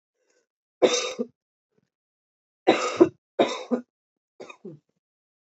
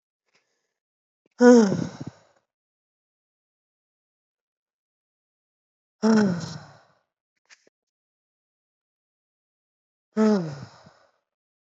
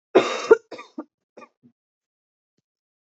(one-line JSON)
{"three_cough_length": "5.5 s", "three_cough_amplitude": 23639, "three_cough_signal_mean_std_ratio": 0.28, "exhalation_length": "11.6 s", "exhalation_amplitude": 25950, "exhalation_signal_mean_std_ratio": 0.24, "cough_length": "3.2 s", "cough_amplitude": 27596, "cough_signal_mean_std_ratio": 0.21, "survey_phase": "beta (2021-08-13 to 2022-03-07)", "age": "18-44", "gender": "Female", "wearing_mask": "No", "symptom_cough_any": true, "symptom_runny_or_blocked_nose": true, "symptom_sore_throat": true, "symptom_headache": true, "symptom_change_to_sense_of_smell_or_taste": true, "smoker_status": "Ex-smoker", "respiratory_condition_asthma": false, "respiratory_condition_other": false, "recruitment_source": "Test and Trace", "submission_delay": "2 days", "covid_test_result": "Positive", "covid_test_method": "LFT"}